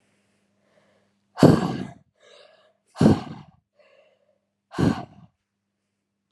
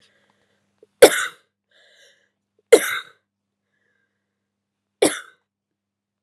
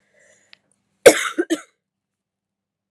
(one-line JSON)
{"exhalation_length": "6.3 s", "exhalation_amplitude": 31599, "exhalation_signal_mean_std_ratio": 0.26, "three_cough_length": "6.2 s", "three_cough_amplitude": 32768, "three_cough_signal_mean_std_ratio": 0.18, "cough_length": "2.9 s", "cough_amplitude": 32768, "cough_signal_mean_std_ratio": 0.2, "survey_phase": "alpha (2021-03-01 to 2021-08-12)", "age": "18-44", "gender": "Female", "wearing_mask": "No", "symptom_cough_any": true, "symptom_fatigue": true, "symptom_headache": true, "symptom_onset": "3 days", "smoker_status": "Never smoked", "respiratory_condition_asthma": false, "respiratory_condition_other": false, "recruitment_source": "Test and Trace", "submission_delay": "1 day", "covid_test_result": "Positive", "covid_test_method": "RT-qPCR", "covid_ct_value": 17.6, "covid_ct_gene": "ORF1ab gene", "covid_ct_mean": 18.1, "covid_viral_load": "1100000 copies/ml", "covid_viral_load_category": "High viral load (>1M copies/ml)"}